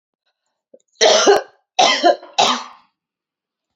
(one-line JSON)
{"three_cough_length": "3.8 s", "three_cough_amplitude": 32447, "three_cough_signal_mean_std_ratio": 0.42, "survey_phase": "alpha (2021-03-01 to 2021-08-12)", "age": "18-44", "gender": "Female", "wearing_mask": "No", "symptom_none": true, "smoker_status": "Never smoked", "respiratory_condition_asthma": false, "respiratory_condition_other": false, "recruitment_source": "REACT", "submission_delay": "2 days", "covid_test_result": "Negative", "covid_test_method": "RT-qPCR"}